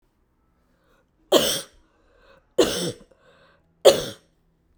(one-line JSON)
{"three_cough_length": "4.8 s", "three_cough_amplitude": 32767, "three_cough_signal_mean_std_ratio": 0.28, "survey_phase": "beta (2021-08-13 to 2022-03-07)", "age": "18-44", "gender": "Female", "wearing_mask": "No", "symptom_none": true, "smoker_status": "Never smoked", "respiratory_condition_asthma": false, "respiratory_condition_other": false, "recruitment_source": "REACT", "submission_delay": "1 day", "covid_test_result": "Negative", "covid_test_method": "RT-qPCR"}